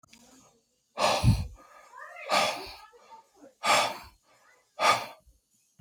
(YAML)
exhalation_length: 5.8 s
exhalation_amplitude: 12895
exhalation_signal_mean_std_ratio: 0.41
survey_phase: beta (2021-08-13 to 2022-03-07)
age: 18-44
gender: Male
wearing_mask: 'No'
symptom_none: true
smoker_status: Never smoked
respiratory_condition_asthma: false
respiratory_condition_other: false
recruitment_source: REACT
submission_delay: 1 day
covid_test_result: Negative
covid_test_method: RT-qPCR
influenza_a_test_result: Negative
influenza_b_test_result: Negative